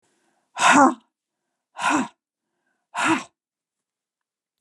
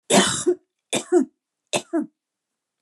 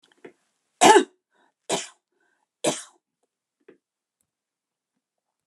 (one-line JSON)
{"exhalation_length": "4.6 s", "exhalation_amplitude": 23950, "exhalation_signal_mean_std_ratio": 0.33, "three_cough_length": "2.8 s", "three_cough_amplitude": 24972, "three_cough_signal_mean_std_ratio": 0.42, "cough_length": "5.5 s", "cough_amplitude": 28900, "cough_signal_mean_std_ratio": 0.2, "survey_phase": "beta (2021-08-13 to 2022-03-07)", "age": "65+", "gender": "Female", "wearing_mask": "No", "symptom_runny_or_blocked_nose": true, "smoker_status": "Never smoked", "respiratory_condition_asthma": false, "respiratory_condition_other": false, "recruitment_source": "REACT", "submission_delay": "1 day", "covid_test_result": "Negative", "covid_test_method": "RT-qPCR"}